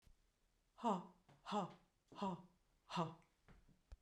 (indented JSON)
{
  "exhalation_length": "4.0 s",
  "exhalation_amplitude": 1421,
  "exhalation_signal_mean_std_ratio": 0.4,
  "survey_phase": "beta (2021-08-13 to 2022-03-07)",
  "age": "45-64",
  "gender": "Female",
  "wearing_mask": "No",
  "symptom_none": true,
  "smoker_status": "Never smoked",
  "respiratory_condition_asthma": false,
  "respiratory_condition_other": false,
  "recruitment_source": "REACT",
  "submission_delay": "1 day",
  "covid_test_result": "Negative",
  "covid_test_method": "RT-qPCR"
}